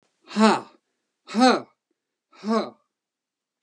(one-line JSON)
{"exhalation_length": "3.6 s", "exhalation_amplitude": 26366, "exhalation_signal_mean_std_ratio": 0.33, "survey_phase": "beta (2021-08-13 to 2022-03-07)", "age": "65+", "gender": "Male", "wearing_mask": "No", "symptom_none": true, "smoker_status": "Never smoked", "respiratory_condition_asthma": false, "respiratory_condition_other": false, "recruitment_source": "REACT", "submission_delay": "1 day", "covid_test_result": "Negative", "covid_test_method": "RT-qPCR"}